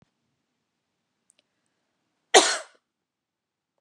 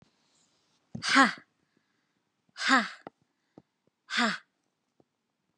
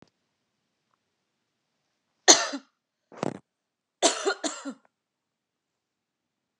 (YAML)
cough_length: 3.8 s
cough_amplitude: 28530
cough_signal_mean_std_ratio: 0.16
exhalation_length: 5.6 s
exhalation_amplitude: 17549
exhalation_signal_mean_std_ratio: 0.27
three_cough_length: 6.6 s
three_cough_amplitude: 32312
three_cough_signal_mean_std_ratio: 0.21
survey_phase: beta (2021-08-13 to 2022-03-07)
age: 45-64
gender: Female
wearing_mask: 'No'
symptom_runny_or_blocked_nose: true
symptom_fatigue: true
symptom_onset: 2 days
smoker_status: Never smoked
respiratory_condition_asthma: false
respiratory_condition_other: false
recruitment_source: Test and Trace
submission_delay: 1 day
covid_test_result: Negative
covid_test_method: ePCR